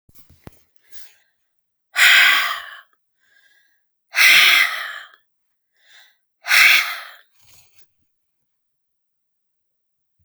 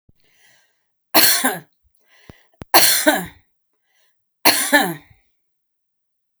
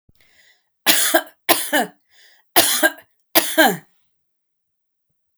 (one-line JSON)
{"exhalation_length": "10.2 s", "exhalation_amplitude": 32768, "exhalation_signal_mean_std_ratio": 0.33, "three_cough_length": "6.4 s", "three_cough_amplitude": 32768, "three_cough_signal_mean_std_ratio": 0.35, "cough_length": "5.4 s", "cough_amplitude": 32768, "cough_signal_mean_std_ratio": 0.38, "survey_phase": "beta (2021-08-13 to 2022-03-07)", "age": "65+", "gender": "Female", "wearing_mask": "No", "symptom_none": true, "smoker_status": "Ex-smoker", "respiratory_condition_asthma": false, "respiratory_condition_other": false, "recruitment_source": "REACT", "submission_delay": "2 days", "covid_test_result": "Negative", "covid_test_method": "RT-qPCR"}